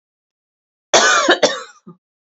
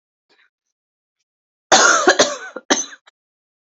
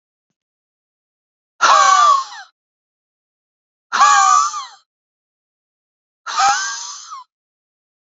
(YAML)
cough_length: 2.2 s
cough_amplitude: 32768
cough_signal_mean_std_ratio: 0.42
three_cough_length: 3.8 s
three_cough_amplitude: 32767
three_cough_signal_mean_std_ratio: 0.34
exhalation_length: 8.1 s
exhalation_amplitude: 31708
exhalation_signal_mean_std_ratio: 0.39
survey_phase: beta (2021-08-13 to 2022-03-07)
age: 18-44
gender: Female
wearing_mask: 'No'
symptom_new_continuous_cough: true
symptom_runny_or_blocked_nose: true
symptom_shortness_of_breath: true
symptom_fatigue: true
symptom_headache: true
symptom_other: true
smoker_status: Never smoked
respiratory_condition_asthma: true
respiratory_condition_other: false
recruitment_source: Test and Trace
submission_delay: 2 days
covid_test_result: Positive
covid_test_method: LFT